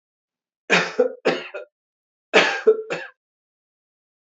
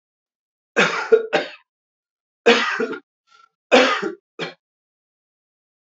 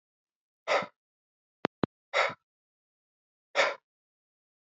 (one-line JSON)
{"cough_length": "4.4 s", "cough_amplitude": 28461, "cough_signal_mean_std_ratio": 0.35, "three_cough_length": "5.9 s", "three_cough_amplitude": 28455, "three_cough_signal_mean_std_ratio": 0.36, "exhalation_length": "4.7 s", "exhalation_amplitude": 13715, "exhalation_signal_mean_std_ratio": 0.25, "survey_phase": "beta (2021-08-13 to 2022-03-07)", "age": "45-64", "gender": "Male", "wearing_mask": "No", "symptom_cough_any": true, "symptom_runny_or_blocked_nose": true, "symptom_fatigue": true, "symptom_headache": true, "smoker_status": "Never smoked", "respiratory_condition_asthma": false, "respiratory_condition_other": false, "recruitment_source": "Test and Trace", "submission_delay": "1 day", "covid_test_result": "Positive", "covid_test_method": "ePCR"}